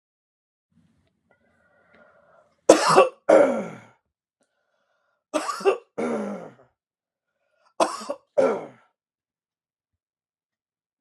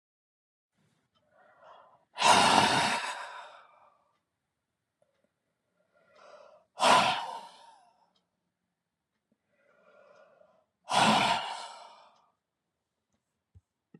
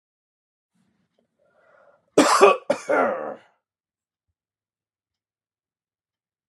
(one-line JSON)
{"three_cough_length": "11.0 s", "three_cough_amplitude": 32732, "three_cough_signal_mean_std_ratio": 0.28, "exhalation_length": "14.0 s", "exhalation_amplitude": 14190, "exhalation_signal_mean_std_ratio": 0.31, "cough_length": "6.5 s", "cough_amplitude": 30466, "cough_signal_mean_std_ratio": 0.26, "survey_phase": "beta (2021-08-13 to 2022-03-07)", "age": "45-64", "gender": "Male", "wearing_mask": "No", "symptom_none": true, "smoker_status": "Never smoked", "respiratory_condition_asthma": false, "respiratory_condition_other": false, "recruitment_source": "REACT", "submission_delay": "0 days", "covid_test_result": "Negative", "covid_test_method": "RT-qPCR"}